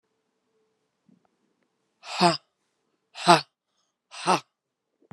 {"exhalation_length": "5.1 s", "exhalation_amplitude": 30536, "exhalation_signal_mean_std_ratio": 0.22, "survey_phase": "beta (2021-08-13 to 2022-03-07)", "age": "45-64", "gender": "Female", "wearing_mask": "No", "symptom_cough_any": true, "symptom_runny_or_blocked_nose": true, "symptom_fatigue": true, "symptom_fever_high_temperature": true, "symptom_headache": true, "symptom_onset": "2 days", "smoker_status": "Never smoked", "respiratory_condition_asthma": false, "respiratory_condition_other": false, "recruitment_source": "Test and Trace", "submission_delay": "2 days", "covid_test_result": "Positive", "covid_test_method": "RT-qPCR", "covid_ct_value": 25.9, "covid_ct_gene": "S gene", "covid_ct_mean": 26.3, "covid_viral_load": "2300 copies/ml", "covid_viral_load_category": "Minimal viral load (< 10K copies/ml)"}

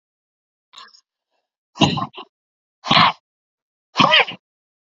{"exhalation_length": "4.9 s", "exhalation_amplitude": 32767, "exhalation_signal_mean_std_ratio": 0.3, "survey_phase": "beta (2021-08-13 to 2022-03-07)", "age": "45-64", "gender": "Female", "wearing_mask": "No", "symptom_cough_any": true, "symptom_diarrhoea": true, "symptom_fatigue": true, "smoker_status": "Never smoked", "respiratory_condition_asthma": true, "respiratory_condition_other": false, "recruitment_source": "REACT", "submission_delay": "1 day", "covid_test_result": "Negative", "covid_test_method": "RT-qPCR", "influenza_a_test_result": "Negative", "influenza_b_test_result": "Negative"}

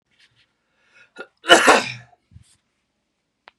{"cough_length": "3.6 s", "cough_amplitude": 32768, "cough_signal_mean_std_ratio": 0.24, "survey_phase": "beta (2021-08-13 to 2022-03-07)", "age": "45-64", "gender": "Male", "wearing_mask": "No", "symptom_cough_any": true, "symptom_new_continuous_cough": true, "symptom_runny_or_blocked_nose": true, "symptom_headache": true, "smoker_status": "Never smoked", "respiratory_condition_asthma": false, "respiratory_condition_other": false, "recruitment_source": "Test and Trace", "submission_delay": "1 day", "covid_test_result": "Positive", "covid_test_method": "RT-qPCR", "covid_ct_value": 27.7, "covid_ct_gene": "N gene"}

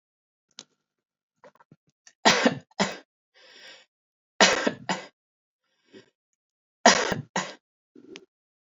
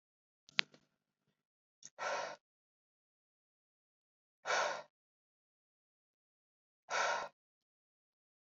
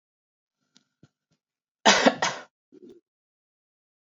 {"three_cough_length": "8.8 s", "three_cough_amplitude": 26623, "three_cough_signal_mean_std_ratio": 0.26, "exhalation_length": "8.5 s", "exhalation_amplitude": 16299, "exhalation_signal_mean_std_ratio": 0.25, "cough_length": "4.0 s", "cough_amplitude": 25938, "cough_signal_mean_std_ratio": 0.23, "survey_phase": "beta (2021-08-13 to 2022-03-07)", "age": "18-44", "gender": "Female", "wearing_mask": "No", "symptom_runny_or_blocked_nose": true, "smoker_status": "Never smoked", "respiratory_condition_asthma": false, "respiratory_condition_other": false, "recruitment_source": "REACT", "submission_delay": "1 day", "covid_test_result": "Negative", "covid_test_method": "RT-qPCR"}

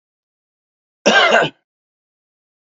{"cough_length": "2.6 s", "cough_amplitude": 29223, "cough_signal_mean_std_ratio": 0.33, "survey_phase": "beta (2021-08-13 to 2022-03-07)", "age": "45-64", "gender": "Male", "wearing_mask": "No", "symptom_cough_any": true, "symptom_shortness_of_breath": true, "symptom_fatigue": true, "symptom_fever_high_temperature": true, "symptom_headache": true, "symptom_change_to_sense_of_smell_or_taste": true, "symptom_loss_of_taste": true, "symptom_onset": "8 days", "smoker_status": "Ex-smoker", "respiratory_condition_asthma": false, "respiratory_condition_other": false, "recruitment_source": "Test and Trace", "submission_delay": "1 day", "covid_test_result": "Positive", "covid_test_method": "RT-qPCR"}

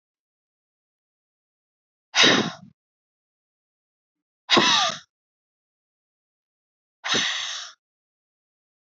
{"exhalation_length": "9.0 s", "exhalation_amplitude": 23210, "exhalation_signal_mean_std_ratio": 0.28, "survey_phase": "alpha (2021-03-01 to 2021-08-12)", "age": "45-64", "gender": "Female", "wearing_mask": "No", "symptom_none": true, "smoker_status": "Never smoked", "respiratory_condition_asthma": true, "respiratory_condition_other": false, "recruitment_source": "REACT", "submission_delay": "1 day", "covid_test_result": "Negative", "covid_test_method": "RT-qPCR"}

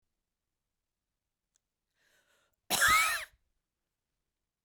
{"cough_length": "4.6 s", "cough_amplitude": 6495, "cough_signal_mean_std_ratio": 0.26, "survey_phase": "beta (2021-08-13 to 2022-03-07)", "age": "45-64", "gender": "Female", "wearing_mask": "No", "symptom_sore_throat": true, "symptom_fatigue": true, "symptom_other": true, "smoker_status": "Current smoker (e-cigarettes or vapes only)", "respiratory_condition_asthma": false, "respiratory_condition_other": false, "recruitment_source": "Test and Trace", "submission_delay": "2 days", "covid_test_result": "Positive", "covid_test_method": "RT-qPCR", "covid_ct_value": 16.8, "covid_ct_gene": "ORF1ab gene", "covid_ct_mean": 17.2, "covid_viral_load": "2300000 copies/ml", "covid_viral_load_category": "High viral load (>1M copies/ml)"}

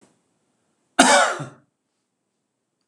{"cough_length": "2.9 s", "cough_amplitude": 26028, "cough_signal_mean_std_ratio": 0.29, "survey_phase": "beta (2021-08-13 to 2022-03-07)", "age": "65+", "gender": "Male", "wearing_mask": "No", "symptom_none": true, "smoker_status": "Never smoked", "respiratory_condition_asthma": false, "respiratory_condition_other": false, "recruitment_source": "REACT", "submission_delay": "2 days", "covid_test_result": "Negative", "covid_test_method": "RT-qPCR", "influenza_a_test_result": "Negative", "influenza_b_test_result": "Negative"}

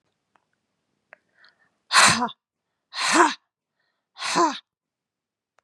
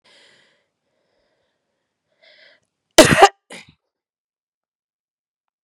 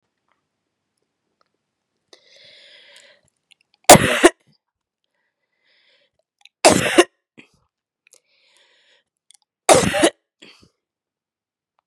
{"exhalation_length": "5.6 s", "exhalation_amplitude": 26118, "exhalation_signal_mean_std_ratio": 0.32, "cough_length": "5.6 s", "cough_amplitude": 32768, "cough_signal_mean_std_ratio": 0.17, "three_cough_length": "11.9 s", "three_cough_amplitude": 32768, "three_cough_signal_mean_std_ratio": 0.21, "survey_phase": "beta (2021-08-13 to 2022-03-07)", "age": "45-64", "gender": "Female", "wearing_mask": "No", "symptom_cough_any": true, "symptom_runny_or_blocked_nose": true, "symptom_fatigue": true, "symptom_headache": true, "symptom_change_to_sense_of_smell_or_taste": true, "symptom_onset": "3 days", "smoker_status": "Ex-smoker", "respiratory_condition_asthma": false, "respiratory_condition_other": false, "recruitment_source": "Test and Trace", "submission_delay": "1 day", "covid_test_result": "Positive", "covid_test_method": "RT-qPCR"}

